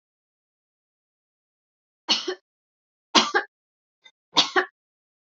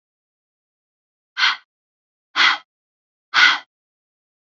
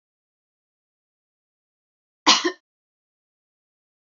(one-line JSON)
{"three_cough_length": "5.3 s", "three_cough_amplitude": 26774, "three_cough_signal_mean_std_ratio": 0.24, "exhalation_length": "4.4 s", "exhalation_amplitude": 32768, "exhalation_signal_mean_std_ratio": 0.28, "cough_length": "4.1 s", "cough_amplitude": 26943, "cough_signal_mean_std_ratio": 0.16, "survey_phase": "alpha (2021-03-01 to 2021-08-12)", "age": "18-44", "gender": "Female", "wearing_mask": "No", "symptom_none": true, "smoker_status": "Never smoked", "respiratory_condition_asthma": false, "respiratory_condition_other": false, "recruitment_source": "REACT", "submission_delay": "1 day", "covid_test_result": "Negative", "covid_test_method": "RT-qPCR"}